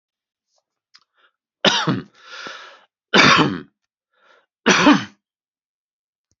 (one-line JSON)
{"three_cough_length": "6.4 s", "three_cough_amplitude": 29453, "three_cough_signal_mean_std_ratio": 0.33, "survey_phase": "beta (2021-08-13 to 2022-03-07)", "age": "45-64", "gender": "Male", "wearing_mask": "No", "symptom_runny_or_blocked_nose": true, "symptom_sore_throat": true, "symptom_fatigue": true, "symptom_headache": true, "smoker_status": "Never smoked", "respiratory_condition_asthma": false, "respiratory_condition_other": false, "recruitment_source": "Test and Trace", "submission_delay": "2 days", "covid_test_result": "Positive", "covid_test_method": "LFT"}